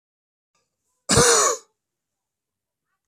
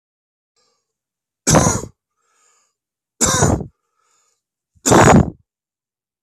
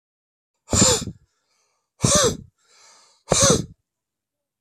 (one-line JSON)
{"cough_length": "3.1 s", "cough_amplitude": 22808, "cough_signal_mean_std_ratio": 0.31, "three_cough_length": "6.2 s", "three_cough_amplitude": 30480, "three_cough_signal_mean_std_ratio": 0.34, "exhalation_length": "4.6 s", "exhalation_amplitude": 25266, "exhalation_signal_mean_std_ratio": 0.37, "survey_phase": "beta (2021-08-13 to 2022-03-07)", "age": "45-64", "gender": "Male", "wearing_mask": "No", "symptom_cough_any": true, "symptom_runny_or_blocked_nose": true, "symptom_sore_throat": true, "symptom_fatigue": true, "symptom_headache": true, "symptom_onset": "3 days", "smoker_status": "Never smoked", "respiratory_condition_asthma": true, "respiratory_condition_other": true, "recruitment_source": "REACT", "submission_delay": "1 day", "covid_test_result": "Negative", "covid_test_method": "RT-qPCR"}